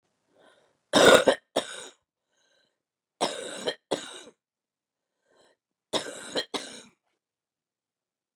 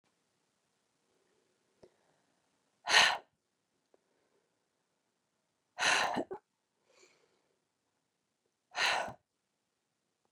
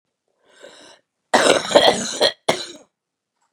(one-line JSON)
{"three_cough_length": "8.4 s", "three_cough_amplitude": 25022, "three_cough_signal_mean_std_ratio": 0.25, "exhalation_length": "10.3 s", "exhalation_amplitude": 9680, "exhalation_signal_mean_std_ratio": 0.23, "cough_length": "3.5 s", "cough_amplitude": 32765, "cough_signal_mean_std_ratio": 0.37, "survey_phase": "beta (2021-08-13 to 2022-03-07)", "age": "45-64", "gender": "Female", "wearing_mask": "No", "symptom_cough_any": true, "symptom_new_continuous_cough": true, "symptom_runny_or_blocked_nose": true, "symptom_shortness_of_breath": true, "symptom_sore_throat": true, "symptom_fatigue": true, "symptom_change_to_sense_of_smell_or_taste": true, "symptom_onset": "4 days", "smoker_status": "Never smoked", "respiratory_condition_asthma": false, "respiratory_condition_other": false, "recruitment_source": "Test and Trace", "submission_delay": "2 days", "covid_test_result": "Positive", "covid_test_method": "RT-qPCR", "covid_ct_value": 19.4, "covid_ct_gene": "ORF1ab gene", "covid_ct_mean": 20.1, "covid_viral_load": "250000 copies/ml", "covid_viral_load_category": "Low viral load (10K-1M copies/ml)"}